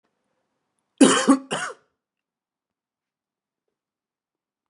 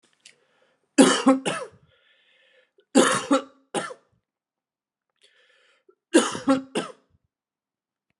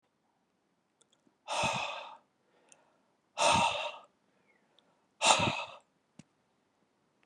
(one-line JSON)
{"cough_length": "4.7 s", "cough_amplitude": 29332, "cough_signal_mean_std_ratio": 0.23, "three_cough_length": "8.2 s", "three_cough_amplitude": 31259, "three_cough_signal_mean_std_ratio": 0.31, "exhalation_length": "7.3 s", "exhalation_amplitude": 15858, "exhalation_signal_mean_std_ratio": 0.34, "survey_phase": "beta (2021-08-13 to 2022-03-07)", "age": "45-64", "gender": "Male", "wearing_mask": "No", "symptom_cough_any": true, "symptom_fatigue": true, "symptom_headache": true, "symptom_onset": "6 days", "smoker_status": "Never smoked", "respiratory_condition_asthma": false, "respiratory_condition_other": false, "recruitment_source": "REACT", "submission_delay": "7 days", "covid_test_result": "Negative", "covid_test_method": "RT-qPCR", "influenza_a_test_result": "Negative", "influenza_b_test_result": "Negative"}